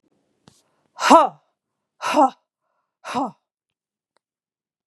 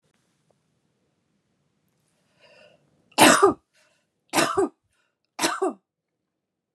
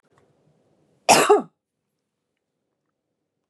{
  "exhalation_length": "4.9 s",
  "exhalation_amplitude": 32758,
  "exhalation_signal_mean_std_ratio": 0.26,
  "three_cough_length": "6.7 s",
  "three_cough_amplitude": 31305,
  "three_cough_signal_mean_std_ratio": 0.27,
  "cough_length": "3.5 s",
  "cough_amplitude": 28589,
  "cough_signal_mean_std_ratio": 0.24,
  "survey_phase": "beta (2021-08-13 to 2022-03-07)",
  "age": "45-64",
  "gender": "Female",
  "wearing_mask": "No",
  "symptom_none": true,
  "smoker_status": "Never smoked",
  "respiratory_condition_asthma": false,
  "respiratory_condition_other": false,
  "recruitment_source": "REACT",
  "submission_delay": "1 day",
  "covid_test_result": "Negative",
  "covid_test_method": "RT-qPCR"
}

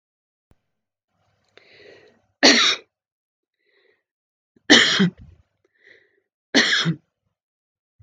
{
  "three_cough_length": "8.0 s",
  "three_cough_amplitude": 32387,
  "three_cough_signal_mean_std_ratio": 0.29,
  "survey_phase": "beta (2021-08-13 to 2022-03-07)",
  "age": "65+",
  "gender": "Female",
  "wearing_mask": "No",
  "symptom_none": true,
  "smoker_status": "Ex-smoker",
  "respiratory_condition_asthma": false,
  "respiratory_condition_other": false,
  "recruitment_source": "REACT",
  "submission_delay": "1 day",
  "covid_test_result": "Negative",
  "covid_test_method": "RT-qPCR"
}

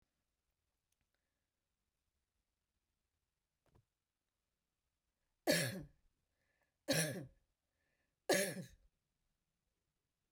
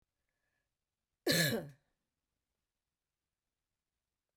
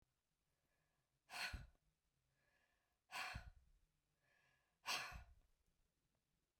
{
  "three_cough_length": "10.3 s",
  "three_cough_amplitude": 3223,
  "three_cough_signal_mean_std_ratio": 0.23,
  "cough_length": "4.4 s",
  "cough_amplitude": 4645,
  "cough_signal_mean_std_ratio": 0.23,
  "exhalation_length": "6.6 s",
  "exhalation_amplitude": 823,
  "exhalation_signal_mean_std_ratio": 0.33,
  "survey_phase": "beta (2021-08-13 to 2022-03-07)",
  "age": "65+",
  "gender": "Female",
  "wearing_mask": "No",
  "symptom_none": true,
  "smoker_status": "Never smoked",
  "respiratory_condition_asthma": false,
  "respiratory_condition_other": false,
  "recruitment_source": "REACT",
  "submission_delay": "1 day",
  "covid_test_result": "Negative",
  "covid_test_method": "RT-qPCR"
}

